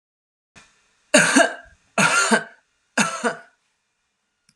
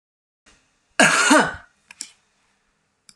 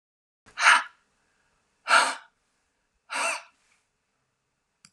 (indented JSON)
{
  "three_cough_length": "4.6 s",
  "three_cough_amplitude": 31729,
  "three_cough_signal_mean_std_ratio": 0.38,
  "cough_length": "3.2 s",
  "cough_amplitude": 31665,
  "cough_signal_mean_std_ratio": 0.33,
  "exhalation_length": "4.9 s",
  "exhalation_amplitude": 25365,
  "exhalation_signal_mean_std_ratio": 0.28,
  "survey_phase": "alpha (2021-03-01 to 2021-08-12)",
  "age": "45-64",
  "gender": "Female",
  "wearing_mask": "No",
  "symptom_none": true,
  "smoker_status": "Ex-smoker",
  "respiratory_condition_asthma": false,
  "respiratory_condition_other": false,
  "recruitment_source": "REACT",
  "submission_delay": "3 days",
  "covid_test_result": "Negative",
  "covid_test_method": "RT-qPCR"
}